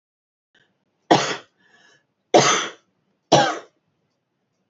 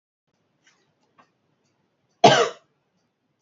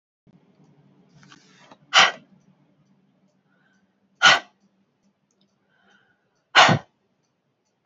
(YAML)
three_cough_length: 4.7 s
three_cough_amplitude: 28369
three_cough_signal_mean_std_ratio: 0.3
cough_length: 3.4 s
cough_amplitude: 31965
cough_signal_mean_std_ratio: 0.2
exhalation_length: 7.9 s
exhalation_amplitude: 28970
exhalation_signal_mean_std_ratio: 0.21
survey_phase: beta (2021-08-13 to 2022-03-07)
age: 18-44
gender: Female
wearing_mask: 'No'
symptom_runny_or_blocked_nose: true
smoker_status: Never smoked
respiratory_condition_asthma: false
respiratory_condition_other: false
recruitment_source: REACT
submission_delay: 1 day
covid_test_result: Negative
covid_test_method: RT-qPCR